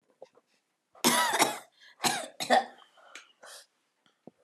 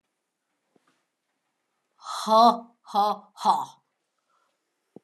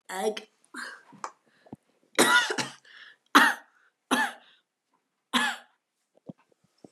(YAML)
cough_length: 4.4 s
cough_amplitude: 11999
cough_signal_mean_std_ratio: 0.37
exhalation_length: 5.0 s
exhalation_amplitude: 15950
exhalation_signal_mean_std_ratio: 0.32
three_cough_length: 6.9 s
three_cough_amplitude: 20555
three_cough_signal_mean_std_ratio: 0.33
survey_phase: beta (2021-08-13 to 2022-03-07)
age: 18-44
gender: Female
wearing_mask: 'No'
symptom_cough_any: true
smoker_status: Never smoked
respiratory_condition_asthma: false
respiratory_condition_other: true
recruitment_source: Test and Trace
submission_delay: 1 day
covid_test_result: Positive
covid_test_method: ePCR